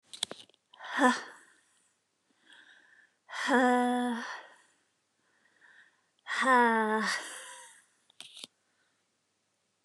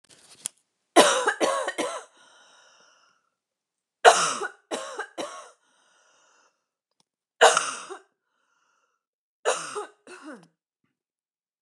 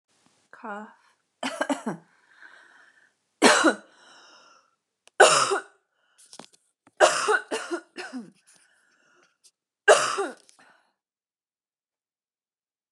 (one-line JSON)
{"exhalation_length": "9.8 s", "exhalation_amplitude": 10428, "exhalation_signal_mean_std_ratio": 0.38, "three_cough_length": "11.6 s", "three_cough_amplitude": 29203, "three_cough_signal_mean_std_ratio": 0.28, "cough_length": "12.9 s", "cough_amplitude": 29101, "cough_signal_mean_std_ratio": 0.29, "survey_phase": "beta (2021-08-13 to 2022-03-07)", "age": "18-44", "gender": "Female", "wearing_mask": "No", "symptom_none": true, "smoker_status": "Never smoked", "respiratory_condition_asthma": false, "respiratory_condition_other": false, "recruitment_source": "REACT", "submission_delay": "1 day", "covid_test_result": "Negative", "covid_test_method": "RT-qPCR", "influenza_a_test_result": "Unknown/Void", "influenza_b_test_result": "Unknown/Void"}